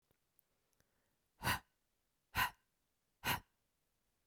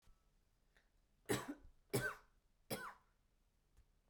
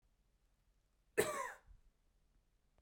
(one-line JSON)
{"exhalation_length": "4.3 s", "exhalation_amplitude": 2474, "exhalation_signal_mean_std_ratio": 0.25, "three_cough_length": "4.1 s", "three_cough_amplitude": 1752, "three_cough_signal_mean_std_ratio": 0.33, "cough_length": "2.8 s", "cough_amplitude": 3721, "cough_signal_mean_std_ratio": 0.27, "survey_phase": "beta (2021-08-13 to 2022-03-07)", "age": "18-44", "gender": "Female", "wearing_mask": "No", "symptom_none": true, "smoker_status": "Never smoked", "respiratory_condition_asthma": false, "respiratory_condition_other": false, "recruitment_source": "REACT", "submission_delay": "1 day", "covid_test_result": "Negative", "covid_test_method": "RT-qPCR"}